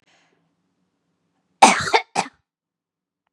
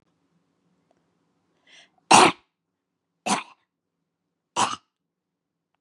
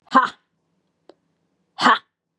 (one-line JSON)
{"cough_length": "3.3 s", "cough_amplitude": 32768, "cough_signal_mean_std_ratio": 0.23, "three_cough_length": "5.8 s", "three_cough_amplitude": 31477, "three_cough_signal_mean_std_ratio": 0.2, "exhalation_length": "2.4 s", "exhalation_amplitude": 31483, "exhalation_signal_mean_std_ratio": 0.28, "survey_phase": "beta (2021-08-13 to 2022-03-07)", "age": "45-64", "gender": "Female", "wearing_mask": "No", "symptom_none": true, "smoker_status": "Ex-smoker", "respiratory_condition_asthma": false, "respiratory_condition_other": false, "recruitment_source": "REACT", "submission_delay": "0 days", "covid_test_result": "Negative", "covid_test_method": "RT-qPCR", "influenza_a_test_result": "Negative", "influenza_b_test_result": "Negative"}